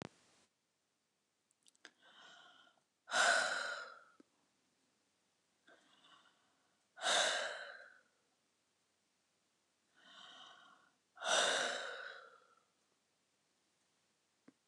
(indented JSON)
{
  "exhalation_length": "14.7 s",
  "exhalation_amplitude": 3485,
  "exhalation_signal_mean_std_ratio": 0.32,
  "survey_phase": "beta (2021-08-13 to 2022-03-07)",
  "age": "65+",
  "gender": "Female",
  "wearing_mask": "No",
  "symptom_none": true,
  "smoker_status": "Never smoked",
  "respiratory_condition_asthma": false,
  "respiratory_condition_other": false,
  "recruitment_source": "REACT",
  "submission_delay": "13 days",
  "covid_test_result": "Negative",
  "covid_test_method": "RT-qPCR"
}